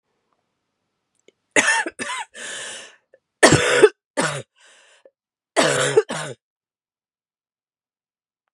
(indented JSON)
{
  "three_cough_length": "8.5 s",
  "three_cough_amplitude": 32768,
  "three_cough_signal_mean_std_ratio": 0.33,
  "survey_phase": "beta (2021-08-13 to 2022-03-07)",
  "age": "18-44",
  "gender": "Female",
  "wearing_mask": "No",
  "symptom_cough_any": true,
  "symptom_runny_or_blocked_nose": true,
  "symptom_sore_throat": true,
  "symptom_onset": "6 days",
  "smoker_status": "Never smoked",
  "respiratory_condition_asthma": false,
  "respiratory_condition_other": false,
  "recruitment_source": "Test and Trace",
  "submission_delay": "2 days",
  "covid_test_result": "Positive",
  "covid_test_method": "RT-qPCR",
  "covid_ct_value": 11.8,
  "covid_ct_gene": "ORF1ab gene",
  "covid_ct_mean": 11.9,
  "covid_viral_load": "120000000 copies/ml",
  "covid_viral_load_category": "High viral load (>1M copies/ml)"
}